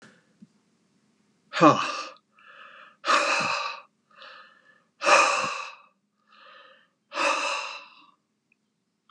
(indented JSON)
{
  "exhalation_length": "9.1 s",
  "exhalation_amplitude": 23863,
  "exhalation_signal_mean_std_ratio": 0.37,
  "survey_phase": "beta (2021-08-13 to 2022-03-07)",
  "age": "65+",
  "gender": "Male",
  "wearing_mask": "No",
  "symptom_none": true,
  "smoker_status": "Never smoked",
  "respiratory_condition_asthma": false,
  "respiratory_condition_other": false,
  "recruitment_source": "REACT",
  "submission_delay": "1 day",
  "covid_test_result": "Negative",
  "covid_test_method": "RT-qPCR",
  "influenza_a_test_result": "Negative",
  "influenza_b_test_result": "Negative"
}